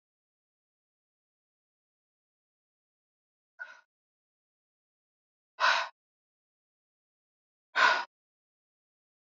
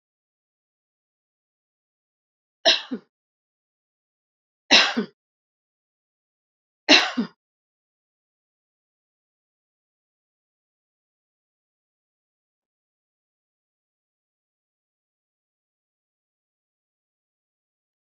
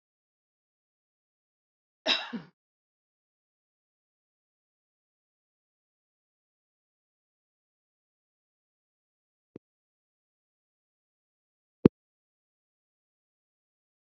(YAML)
exhalation_length: 9.3 s
exhalation_amplitude: 9896
exhalation_signal_mean_std_ratio: 0.18
three_cough_length: 18.0 s
three_cough_amplitude: 31440
three_cough_signal_mean_std_ratio: 0.14
cough_length: 14.2 s
cough_amplitude: 27181
cough_signal_mean_std_ratio: 0.07
survey_phase: beta (2021-08-13 to 2022-03-07)
age: 65+
gender: Female
wearing_mask: 'No'
symptom_none: true
smoker_status: Never smoked
respiratory_condition_asthma: false
respiratory_condition_other: false
recruitment_source: REACT
submission_delay: 1 day
covid_test_result: Negative
covid_test_method: RT-qPCR
influenza_a_test_result: Negative
influenza_b_test_result: Negative